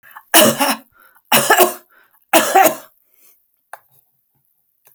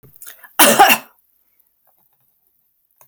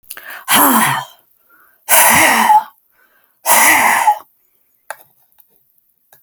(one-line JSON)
{"three_cough_length": "4.9 s", "three_cough_amplitude": 32768, "three_cough_signal_mean_std_ratio": 0.38, "cough_length": "3.1 s", "cough_amplitude": 32768, "cough_signal_mean_std_ratio": 0.29, "exhalation_length": "6.2 s", "exhalation_amplitude": 32768, "exhalation_signal_mean_std_ratio": 0.5, "survey_phase": "alpha (2021-03-01 to 2021-08-12)", "age": "65+", "gender": "Female", "wearing_mask": "No", "symptom_none": true, "smoker_status": "Never smoked", "respiratory_condition_asthma": false, "respiratory_condition_other": false, "recruitment_source": "REACT", "submission_delay": "2 days", "covid_test_result": "Negative", "covid_test_method": "RT-qPCR"}